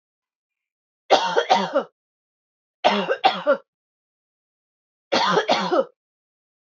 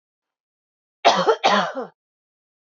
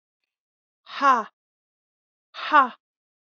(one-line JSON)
{"three_cough_length": "6.7 s", "three_cough_amplitude": 26698, "three_cough_signal_mean_std_ratio": 0.41, "cough_length": "2.7 s", "cough_amplitude": 25847, "cough_signal_mean_std_ratio": 0.37, "exhalation_length": "3.2 s", "exhalation_amplitude": 23381, "exhalation_signal_mean_std_ratio": 0.28, "survey_phase": "beta (2021-08-13 to 2022-03-07)", "age": "18-44", "gender": "Female", "wearing_mask": "No", "symptom_sore_throat": true, "symptom_fatigue": true, "symptom_fever_high_temperature": true, "symptom_headache": true, "symptom_other": true, "symptom_onset": "4 days", "smoker_status": "Never smoked", "respiratory_condition_asthma": false, "respiratory_condition_other": false, "recruitment_source": "Test and Trace", "submission_delay": "2 days", "covid_test_result": "Negative", "covid_test_method": "RT-qPCR"}